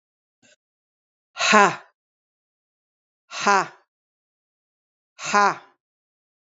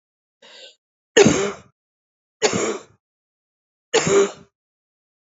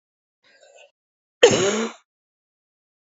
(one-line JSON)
{"exhalation_length": "6.6 s", "exhalation_amplitude": 32767, "exhalation_signal_mean_std_ratio": 0.25, "three_cough_length": "5.3 s", "three_cough_amplitude": 32768, "three_cough_signal_mean_std_ratio": 0.33, "cough_length": "3.1 s", "cough_amplitude": 32768, "cough_signal_mean_std_ratio": 0.27, "survey_phase": "beta (2021-08-13 to 2022-03-07)", "age": "45-64", "gender": "Female", "wearing_mask": "No", "symptom_cough_any": true, "symptom_runny_or_blocked_nose": true, "symptom_diarrhoea": true, "symptom_fatigue": true, "symptom_change_to_sense_of_smell_or_taste": true, "symptom_loss_of_taste": true, "smoker_status": "Never smoked", "respiratory_condition_asthma": false, "respiratory_condition_other": false, "recruitment_source": "Test and Trace", "submission_delay": "-1 day", "covid_test_result": "Negative", "covid_test_method": "LFT"}